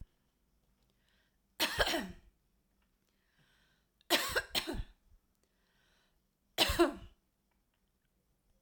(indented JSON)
{
  "three_cough_length": "8.6 s",
  "three_cough_amplitude": 7436,
  "three_cough_signal_mean_std_ratio": 0.3,
  "survey_phase": "alpha (2021-03-01 to 2021-08-12)",
  "age": "45-64",
  "gender": "Female",
  "wearing_mask": "No",
  "symptom_none": true,
  "smoker_status": "Ex-smoker",
  "respiratory_condition_asthma": false,
  "respiratory_condition_other": false,
  "recruitment_source": "REACT",
  "submission_delay": "2 days",
  "covid_test_result": "Negative",
  "covid_test_method": "RT-qPCR"
}